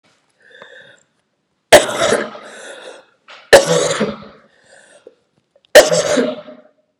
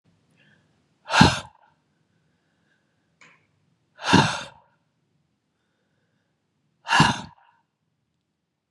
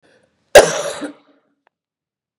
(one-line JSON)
{"three_cough_length": "7.0 s", "three_cough_amplitude": 32768, "three_cough_signal_mean_std_ratio": 0.35, "exhalation_length": "8.7 s", "exhalation_amplitude": 32613, "exhalation_signal_mean_std_ratio": 0.23, "cough_length": "2.4 s", "cough_amplitude": 32768, "cough_signal_mean_std_ratio": 0.24, "survey_phase": "beta (2021-08-13 to 2022-03-07)", "age": "45-64", "gender": "Female", "wearing_mask": "No", "symptom_cough_any": true, "symptom_runny_or_blocked_nose": true, "symptom_sore_throat": true, "symptom_diarrhoea": true, "symptom_fatigue": true, "symptom_headache": true, "symptom_change_to_sense_of_smell_or_taste": true, "symptom_onset": "5 days", "smoker_status": "Ex-smoker", "respiratory_condition_asthma": false, "respiratory_condition_other": false, "recruitment_source": "Test and Trace", "submission_delay": "1 day", "covid_test_result": "Positive", "covid_test_method": "RT-qPCR", "covid_ct_value": 17.2, "covid_ct_gene": "ORF1ab gene", "covid_ct_mean": 17.8, "covid_viral_load": "1400000 copies/ml", "covid_viral_load_category": "High viral load (>1M copies/ml)"}